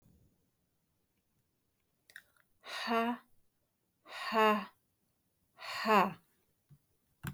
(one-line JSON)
{"exhalation_length": "7.3 s", "exhalation_amplitude": 7015, "exhalation_signal_mean_std_ratio": 0.32, "survey_phase": "beta (2021-08-13 to 2022-03-07)", "age": "18-44", "gender": "Female", "wearing_mask": "No", "symptom_none": true, "smoker_status": "Never smoked", "respiratory_condition_asthma": false, "respiratory_condition_other": false, "recruitment_source": "REACT", "submission_delay": "1 day", "covid_test_result": "Negative", "covid_test_method": "RT-qPCR", "influenza_a_test_result": "Negative", "influenza_b_test_result": "Negative"}